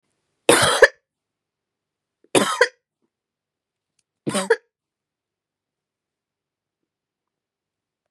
{
  "three_cough_length": "8.1 s",
  "three_cough_amplitude": 32768,
  "three_cough_signal_mean_std_ratio": 0.22,
  "survey_phase": "beta (2021-08-13 to 2022-03-07)",
  "age": "45-64",
  "gender": "Female",
  "wearing_mask": "No",
  "symptom_cough_any": true,
  "symptom_runny_or_blocked_nose": true,
  "smoker_status": "Never smoked",
  "respiratory_condition_asthma": false,
  "respiratory_condition_other": false,
  "recruitment_source": "Test and Trace",
  "submission_delay": "1 day",
  "covid_test_result": "Positive",
  "covid_test_method": "RT-qPCR",
  "covid_ct_value": 30.2,
  "covid_ct_gene": "N gene"
}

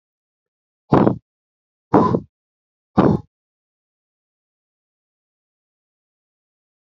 {
  "exhalation_length": "7.0 s",
  "exhalation_amplitude": 31839,
  "exhalation_signal_mean_std_ratio": 0.23,
  "survey_phase": "beta (2021-08-13 to 2022-03-07)",
  "age": "45-64",
  "gender": "Male",
  "wearing_mask": "No",
  "symptom_runny_or_blocked_nose": true,
  "symptom_shortness_of_breath": true,
  "symptom_onset": "2 days",
  "smoker_status": "Ex-smoker",
  "respiratory_condition_asthma": true,
  "respiratory_condition_other": true,
  "recruitment_source": "Test and Trace",
  "submission_delay": "2 days",
  "covid_test_result": "Positive",
  "covid_test_method": "RT-qPCR"
}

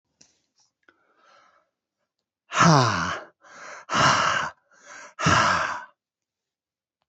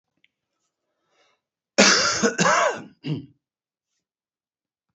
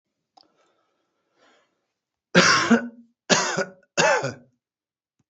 {
  "exhalation_length": "7.1 s",
  "exhalation_amplitude": 24112,
  "exhalation_signal_mean_std_ratio": 0.41,
  "cough_length": "4.9 s",
  "cough_amplitude": 32767,
  "cough_signal_mean_std_ratio": 0.36,
  "three_cough_length": "5.3 s",
  "three_cough_amplitude": 26189,
  "three_cough_signal_mean_std_ratio": 0.36,
  "survey_phase": "beta (2021-08-13 to 2022-03-07)",
  "age": "65+",
  "gender": "Male",
  "wearing_mask": "No",
  "symptom_none": true,
  "smoker_status": "Never smoked",
  "respiratory_condition_asthma": false,
  "respiratory_condition_other": false,
  "recruitment_source": "REACT",
  "submission_delay": "3 days",
  "covid_test_result": "Negative",
  "covid_test_method": "RT-qPCR",
  "influenza_a_test_result": "Negative",
  "influenza_b_test_result": "Negative"
}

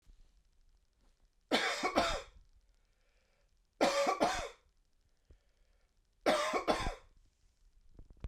{
  "three_cough_length": "8.3 s",
  "three_cough_amplitude": 6870,
  "three_cough_signal_mean_std_ratio": 0.41,
  "survey_phase": "beta (2021-08-13 to 2022-03-07)",
  "age": "18-44",
  "gender": "Male",
  "wearing_mask": "No",
  "symptom_runny_or_blocked_nose": true,
  "symptom_fatigue": true,
  "symptom_headache": true,
  "symptom_loss_of_taste": true,
  "symptom_onset": "2 days",
  "smoker_status": "Never smoked",
  "respiratory_condition_asthma": false,
  "respiratory_condition_other": true,
  "recruitment_source": "Test and Trace",
  "submission_delay": "1 day",
  "covid_test_result": "Positive",
  "covid_test_method": "ePCR"
}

